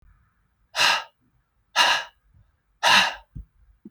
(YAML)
exhalation_length: 3.9 s
exhalation_amplitude: 21452
exhalation_signal_mean_std_ratio: 0.37
survey_phase: beta (2021-08-13 to 2022-03-07)
age: 18-44
gender: Male
wearing_mask: 'No'
symptom_none: true
smoker_status: Never smoked
respiratory_condition_asthma: false
respiratory_condition_other: false
recruitment_source: REACT
submission_delay: 1 day
covid_test_result: Negative
covid_test_method: RT-qPCR
influenza_a_test_result: Negative
influenza_b_test_result: Negative